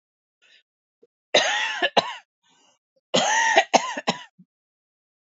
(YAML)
three_cough_length: 5.3 s
three_cough_amplitude: 28311
three_cough_signal_mean_std_ratio: 0.39
survey_phase: beta (2021-08-13 to 2022-03-07)
age: 45-64
gender: Female
wearing_mask: 'No'
symptom_new_continuous_cough: true
symptom_shortness_of_breath: true
symptom_sore_throat: true
symptom_fatigue: true
symptom_fever_high_temperature: true
symptom_headache: true
symptom_onset: 4 days
smoker_status: Ex-smoker
respiratory_condition_asthma: false
respiratory_condition_other: true
recruitment_source: Test and Trace
submission_delay: 2 days
covid_test_result: Positive
covid_test_method: RT-qPCR
covid_ct_value: 21.0
covid_ct_gene: N gene